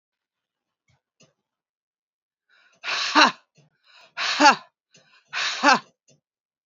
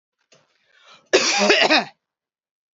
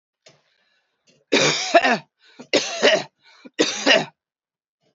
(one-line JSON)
{"exhalation_length": "6.7 s", "exhalation_amplitude": 29571, "exhalation_signal_mean_std_ratio": 0.28, "cough_length": "2.7 s", "cough_amplitude": 29673, "cough_signal_mean_std_ratio": 0.41, "three_cough_length": "4.9 s", "three_cough_amplitude": 28886, "three_cough_signal_mean_std_ratio": 0.41, "survey_phase": "beta (2021-08-13 to 2022-03-07)", "age": "45-64", "gender": "Female", "wearing_mask": "No", "symptom_none": true, "smoker_status": "Never smoked", "respiratory_condition_asthma": false, "respiratory_condition_other": false, "recruitment_source": "REACT", "submission_delay": "1 day", "covid_test_result": "Negative", "covid_test_method": "RT-qPCR", "influenza_a_test_result": "Negative", "influenza_b_test_result": "Negative"}